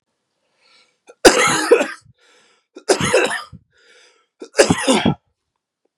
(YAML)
three_cough_length: 6.0 s
three_cough_amplitude: 32768
three_cough_signal_mean_std_ratio: 0.38
survey_phase: beta (2021-08-13 to 2022-03-07)
age: 18-44
gender: Male
wearing_mask: 'No'
symptom_cough_any: true
symptom_runny_or_blocked_nose: true
symptom_fatigue: true
symptom_change_to_sense_of_smell_or_taste: true
symptom_loss_of_taste: true
symptom_onset: 3 days
smoker_status: Never smoked
respiratory_condition_asthma: true
respiratory_condition_other: false
recruitment_source: Test and Trace
submission_delay: 2 days
covid_test_result: Positive
covid_test_method: RT-qPCR
covid_ct_value: 17.3
covid_ct_gene: N gene
covid_ct_mean: 17.4
covid_viral_load: 1900000 copies/ml
covid_viral_load_category: High viral load (>1M copies/ml)